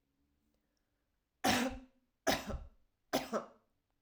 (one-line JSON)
{"three_cough_length": "4.0 s", "three_cough_amplitude": 4489, "three_cough_signal_mean_std_ratio": 0.36, "survey_phase": "beta (2021-08-13 to 2022-03-07)", "age": "45-64", "gender": "Female", "wearing_mask": "No", "symptom_cough_any": true, "symptom_fatigue": true, "symptom_change_to_sense_of_smell_or_taste": true, "symptom_loss_of_taste": true, "symptom_onset": "4 days", "smoker_status": "Ex-smoker", "respiratory_condition_asthma": false, "respiratory_condition_other": false, "recruitment_source": "Test and Trace", "submission_delay": "2 days", "covid_test_result": "Positive", "covid_test_method": "RT-qPCR", "covid_ct_value": 16.8, "covid_ct_gene": "ORF1ab gene", "covid_ct_mean": 17.3, "covid_viral_load": "2100000 copies/ml", "covid_viral_load_category": "High viral load (>1M copies/ml)"}